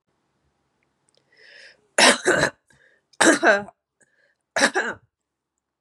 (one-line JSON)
{"three_cough_length": "5.8 s", "three_cough_amplitude": 32767, "three_cough_signal_mean_std_ratio": 0.33, "survey_phase": "beta (2021-08-13 to 2022-03-07)", "age": "45-64", "gender": "Female", "wearing_mask": "No", "symptom_cough_any": true, "symptom_runny_or_blocked_nose": true, "symptom_fatigue": true, "symptom_change_to_sense_of_smell_or_taste": true, "symptom_loss_of_taste": true, "symptom_onset": "3 days", "smoker_status": "Never smoked", "respiratory_condition_asthma": false, "respiratory_condition_other": false, "recruitment_source": "REACT", "submission_delay": "2 days", "covid_test_result": "Positive", "covid_test_method": "RT-qPCR", "covid_ct_value": 19.0, "covid_ct_gene": "E gene", "influenza_a_test_result": "Negative", "influenza_b_test_result": "Negative"}